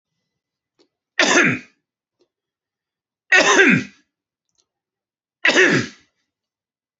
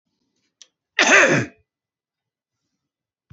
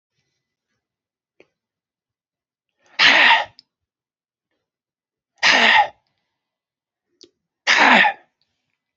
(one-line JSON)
{"three_cough_length": "7.0 s", "three_cough_amplitude": 32767, "three_cough_signal_mean_std_ratio": 0.34, "cough_length": "3.3 s", "cough_amplitude": 28007, "cough_signal_mean_std_ratio": 0.29, "exhalation_length": "9.0 s", "exhalation_amplitude": 29686, "exhalation_signal_mean_std_ratio": 0.31, "survey_phase": "beta (2021-08-13 to 2022-03-07)", "age": "45-64", "gender": "Male", "wearing_mask": "No", "symptom_cough_any": true, "symptom_onset": "4 days", "smoker_status": "Never smoked", "respiratory_condition_asthma": false, "respiratory_condition_other": false, "recruitment_source": "Test and Trace", "submission_delay": "2 days", "covid_test_result": "Positive", "covid_test_method": "RT-qPCR", "covid_ct_value": 21.7, "covid_ct_gene": "ORF1ab gene"}